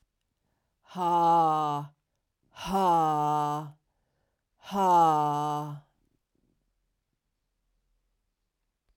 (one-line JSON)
{"exhalation_length": "9.0 s", "exhalation_amplitude": 8036, "exhalation_signal_mean_std_ratio": 0.5, "survey_phase": "alpha (2021-03-01 to 2021-08-12)", "age": "45-64", "gender": "Female", "wearing_mask": "No", "symptom_new_continuous_cough": true, "symptom_shortness_of_breath": true, "symptom_abdominal_pain": true, "symptom_diarrhoea": true, "symptom_fatigue": true, "symptom_fever_high_temperature": true, "symptom_headache": true, "smoker_status": "Never smoked", "respiratory_condition_asthma": false, "respiratory_condition_other": false, "recruitment_source": "Test and Trace", "submission_delay": "2 days", "covid_test_result": "Positive", "covid_test_method": "RT-qPCR", "covid_ct_value": 17.6, "covid_ct_gene": "ORF1ab gene", "covid_ct_mean": 18.1, "covid_viral_load": "1100000 copies/ml", "covid_viral_load_category": "High viral load (>1M copies/ml)"}